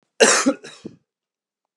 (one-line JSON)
{"cough_length": "1.8 s", "cough_amplitude": 32167, "cough_signal_mean_std_ratio": 0.34, "survey_phase": "beta (2021-08-13 to 2022-03-07)", "age": "45-64", "gender": "Male", "wearing_mask": "No", "symptom_cough_any": true, "symptom_runny_or_blocked_nose": true, "symptom_fever_high_temperature": true, "symptom_headache": true, "smoker_status": "Ex-smoker", "respiratory_condition_asthma": false, "respiratory_condition_other": false, "recruitment_source": "Test and Trace", "submission_delay": "2 days", "covid_test_result": "Positive", "covid_test_method": "LFT"}